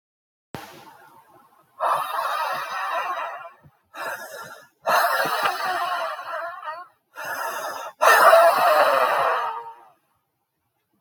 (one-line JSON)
{"exhalation_length": "11.0 s", "exhalation_amplitude": 25960, "exhalation_signal_mean_std_ratio": 0.55, "survey_phase": "beta (2021-08-13 to 2022-03-07)", "age": "65+", "gender": "Male", "wearing_mask": "No", "symptom_cough_any": true, "symptom_fever_high_temperature": true, "symptom_headache": true, "symptom_onset": "3 days", "smoker_status": "Ex-smoker", "respiratory_condition_asthma": false, "respiratory_condition_other": true, "recruitment_source": "Test and Trace", "submission_delay": "1 day", "covid_test_result": "Positive", "covid_test_method": "RT-qPCR", "covid_ct_value": 18.0, "covid_ct_gene": "N gene"}